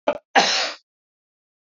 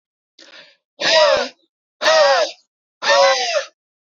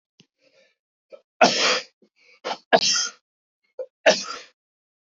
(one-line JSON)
{"cough_length": "1.8 s", "cough_amplitude": 26051, "cough_signal_mean_std_ratio": 0.37, "exhalation_length": "4.1 s", "exhalation_amplitude": 27314, "exhalation_signal_mean_std_ratio": 0.53, "three_cough_length": "5.1 s", "three_cough_amplitude": 30176, "three_cough_signal_mean_std_ratio": 0.33, "survey_phase": "beta (2021-08-13 to 2022-03-07)", "age": "18-44", "gender": "Male", "wearing_mask": "No", "symptom_none": true, "smoker_status": "Never smoked", "respiratory_condition_asthma": false, "respiratory_condition_other": false, "recruitment_source": "REACT", "submission_delay": "1 day", "covid_test_result": "Negative", "covid_test_method": "RT-qPCR", "covid_ct_value": 39.0, "covid_ct_gene": "N gene", "influenza_a_test_result": "Unknown/Void", "influenza_b_test_result": "Unknown/Void"}